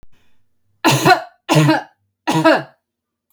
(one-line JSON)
{"three_cough_length": "3.3 s", "three_cough_amplitude": 29463, "three_cough_signal_mean_std_ratio": 0.46, "survey_phase": "beta (2021-08-13 to 2022-03-07)", "age": "45-64", "gender": "Female", "wearing_mask": "No", "symptom_none": true, "smoker_status": "Never smoked", "respiratory_condition_asthma": false, "respiratory_condition_other": false, "recruitment_source": "REACT", "submission_delay": "1 day", "covid_test_result": "Negative", "covid_test_method": "RT-qPCR"}